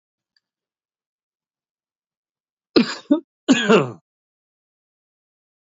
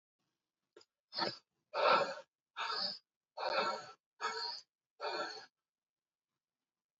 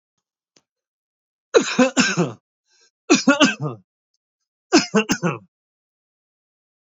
{
  "cough_length": "5.7 s",
  "cough_amplitude": 28839,
  "cough_signal_mean_std_ratio": 0.24,
  "exhalation_length": "7.0 s",
  "exhalation_amplitude": 4340,
  "exhalation_signal_mean_std_ratio": 0.41,
  "three_cough_length": "6.9 s",
  "three_cough_amplitude": 29017,
  "three_cough_signal_mean_std_ratio": 0.34,
  "survey_phase": "beta (2021-08-13 to 2022-03-07)",
  "age": "45-64",
  "gender": "Male",
  "wearing_mask": "No",
  "symptom_abdominal_pain": true,
  "symptom_fatigue": true,
  "smoker_status": "Ex-smoker",
  "respiratory_condition_asthma": false,
  "respiratory_condition_other": false,
  "recruitment_source": "Test and Trace",
  "submission_delay": "2 days",
  "covid_test_result": "Positive",
  "covid_test_method": "RT-qPCR",
  "covid_ct_value": 19.4,
  "covid_ct_gene": "ORF1ab gene",
  "covid_ct_mean": 19.7,
  "covid_viral_load": "340000 copies/ml",
  "covid_viral_load_category": "Low viral load (10K-1M copies/ml)"
}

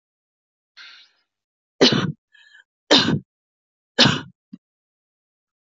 {
  "three_cough_length": "5.6 s",
  "three_cough_amplitude": 27881,
  "three_cough_signal_mean_std_ratio": 0.28,
  "survey_phase": "beta (2021-08-13 to 2022-03-07)",
  "age": "45-64",
  "gender": "Female",
  "wearing_mask": "No",
  "symptom_cough_any": true,
  "symptom_runny_or_blocked_nose": true,
  "symptom_sore_throat": true,
  "symptom_fatigue": true,
  "symptom_fever_high_temperature": true,
  "symptom_headache": true,
  "symptom_change_to_sense_of_smell_or_taste": true,
  "symptom_onset": "4 days",
  "smoker_status": "Never smoked",
  "respiratory_condition_asthma": false,
  "respiratory_condition_other": false,
  "recruitment_source": "Test and Trace",
  "submission_delay": "2 days",
  "covid_test_result": "Positive",
  "covid_test_method": "ePCR"
}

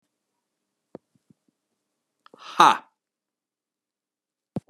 {
  "exhalation_length": "4.7 s",
  "exhalation_amplitude": 32756,
  "exhalation_signal_mean_std_ratio": 0.15,
  "survey_phase": "beta (2021-08-13 to 2022-03-07)",
  "age": "45-64",
  "gender": "Male",
  "wearing_mask": "Yes",
  "symptom_cough_any": true,
  "symptom_runny_or_blocked_nose": true,
  "symptom_onset": "3 days",
  "smoker_status": "Ex-smoker",
  "respiratory_condition_asthma": false,
  "respiratory_condition_other": false,
  "recruitment_source": "Test and Trace",
  "submission_delay": "2 days",
  "covid_test_result": "Positive",
  "covid_test_method": "RT-qPCR",
  "covid_ct_value": 22.2,
  "covid_ct_gene": "ORF1ab gene"
}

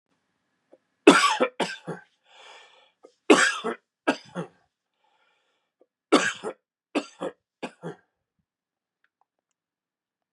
{
  "three_cough_length": "10.3 s",
  "three_cough_amplitude": 32532,
  "three_cough_signal_mean_std_ratio": 0.25,
  "survey_phase": "beta (2021-08-13 to 2022-03-07)",
  "age": "45-64",
  "gender": "Male",
  "wearing_mask": "No",
  "symptom_fatigue": true,
  "symptom_onset": "11 days",
  "smoker_status": "Ex-smoker",
  "respiratory_condition_asthma": false,
  "respiratory_condition_other": false,
  "recruitment_source": "REACT",
  "submission_delay": "1 day",
  "covid_test_result": "Negative",
  "covid_test_method": "RT-qPCR",
  "influenza_a_test_result": "Negative",
  "influenza_b_test_result": "Negative"
}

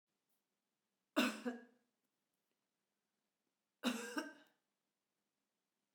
{
  "cough_length": "5.9 s",
  "cough_amplitude": 2649,
  "cough_signal_mean_std_ratio": 0.26,
  "survey_phase": "beta (2021-08-13 to 2022-03-07)",
  "age": "65+",
  "gender": "Female",
  "wearing_mask": "No",
  "symptom_none": true,
  "symptom_onset": "6 days",
  "smoker_status": "Ex-smoker",
  "respiratory_condition_asthma": false,
  "respiratory_condition_other": false,
  "recruitment_source": "REACT",
  "submission_delay": "1 day",
  "covid_test_result": "Negative",
  "covid_test_method": "RT-qPCR",
  "influenza_a_test_result": "Negative",
  "influenza_b_test_result": "Negative"
}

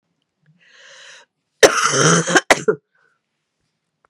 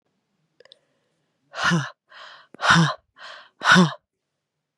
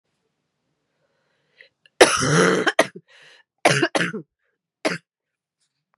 {
  "cough_length": "4.1 s",
  "cough_amplitude": 32768,
  "cough_signal_mean_std_ratio": 0.34,
  "exhalation_length": "4.8 s",
  "exhalation_amplitude": 27952,
  "exhalation_signal_mean_std_ratio": 0.35,
  "three_cough_length": "6.0 s",
  "three_cough_amplitude": 32768,
  "three_cough_signal_mean_std_ratio": 0.33,
  "survey_phase": "beta (2021-08-13 to 2022-03-07)",
  "age": "18-44",
  "gender": "Female",
  "wearing_mask": "No",
  "symptom_cough_any": true,
  "symptom_runny_or_blocked_nose": true,
  "symptom_sore_throat": true,
  "symptom_fatigue": true,
  "symptom_change_to_sense_of_smell_or_taste": true,
  "symptom_loss_of_taste": true,
  "smoker_status": "Never smoked",
  "respiratory_condition_asthma": false,
  "respiratory_condition_other": false,
  "recruitment_source": "Test and Trace",
  "submission_delay": "3 days",
  "covid_test_result": "Positive",
  "covid_test_method": "RT-qPCR",
  "covid_ct_value": 16.0,
  "covid_ct_gene": "ORF1ab gene",
  "covid_ct_mean": 16.6,
  "covid_viral_load": "3500000 copies/ml",
  "covid_viral_load_category": "High viral load (>1M copies/ml)"
}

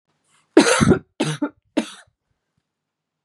{
  "three_cough_length": "3.2 s",
  "three_cough_amplitude": 32139,
  "three_cough_signal_mean_std_ratio": 0.33,
  "survey_phase": "beta (2021-08-13 to 2022-03-07)",
  "age": "18-44",
  "gender": "Female",
  "wearing_mask": "No",
  "symptom_cough_any": true,
  "symptom_new_continuous_cough": true,
  "symptom_runny_or_blocked_nose": true,
  "symptom_sore_throat": true,
  "symptom_fatigue": true,
  "symptom_headache": true,
  "symptom_other": true,
  "symptom_onset": "3 days",
  "smoker_status": "Never smoked",
  "respiratory_condition_asthma": false,
  "respiratory_condition_other": false,
  "recruitment_source": "Test and Trace",
  "submission_delay": "2 days",
  "covid_test_result": "Positive",
  "covid_test_method": "RT-qPCR",
  "covid_ct_value": 14.7,
  "covid_ct_gene": "ORF1ab gene"
}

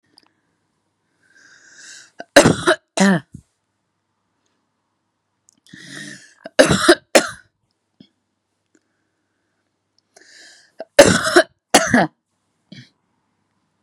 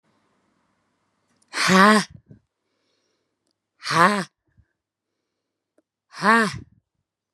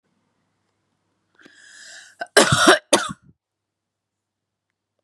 {
  "three_cough_length": "13.8 s",
  "three_cough_amplitude": 32768,
  "three_cough_signal_mean_std_ratio": 0.26,
  "exhalation_length": "7.3 s",
  "exhalation_amplitude": 32725,
  "exhalation_signal_mean_std_ratio": 0.28,
  "cough_length": "5.0 s",
  "cough_amplitude": 32768,
  "cough_signal_mean_std_ratio": 0.25,
  "survey_phase": "beta (2021-08-13 to 2022-03-07)",
  "age": "18-44",
  "gender": "Female",
  "wearing_mask": "No",
  "symptom_cough_any": true,
  "symptom_new_continuous_cough": true,
  "symptom_runny_or_blocked_nose": true,
  "symptom_shortness_of_breath": true,
  "symptom_sore_throat": true,
  "symptom_fatigue": true,
  "symptom_onset": "4 days",
  "smoker_status": "Never smoked",
  "respiratory_condition_asthma": true,
  "respiratory_condition_other": false,
  "recruitment_source": "Test and Trace",
  "submission_delay": "2 days",
  "covid_test_result": "Positive",
  "covid_test_method": "LAMP"
}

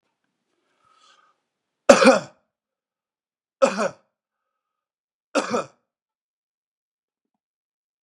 {
  "three_cough_length": "8.0 s",
  "three_cough_amplitude": 32768,
  "three_cough_signal_mean_std_ratio": 0.2,
  "survey_phase": "beta (2021-08-13 to 2022-03-07)",
  "age": "45-64",
  "gender": "Male",
  "wearing_mask": "No",
  "symptom_none": true,
  "smoker_status": "Never smoked",
  "respiratory_condition_asthma": false,
  "respiratory_condition_other": false,
  "recruitment_source": "REACT",
  "submission_delay": "1 day",
  "covid_test_result": "Negative",
  "covid_test_method": "RT-qPCR",
  "influenza_a_test_result": "Negative",
  "influenza_b_test_result": "Negative"
}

